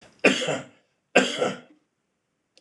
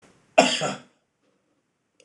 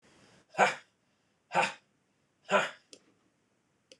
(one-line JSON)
{"three_cough_length": "2.6 s", "three_cough_amplitude": 25077, "three_cough_signal_mean_std_ratio": 0.37, "cough_length": "2.0 s", "cough_amplitude": 26028, "cough_signal_mean_std_ratio": 0.27, "exhalation_length": "4.0 s", "exhalation_amplitude": 10151, "exhalation_signal_mean_std_ratio": 0.28, "survey_phase": "beta (2021-08-13 to 2022-03-07)", "age": "45-64", "gender": "Male", "wearing_mask": "No", "symptom_none": true, "smoker_status": "Never smoked", "respiratory_condition_asthma": false, "respiratory_condition_other": false, "recruitment_source": "REACT", "submission_delay": "1 day", "covid_test_result": "Negative", "covid_test_method": "RT-qPCR", "influenza_a_test_result": "Unknown/Void", "influenza_b_test_result": "Unknown/Void"}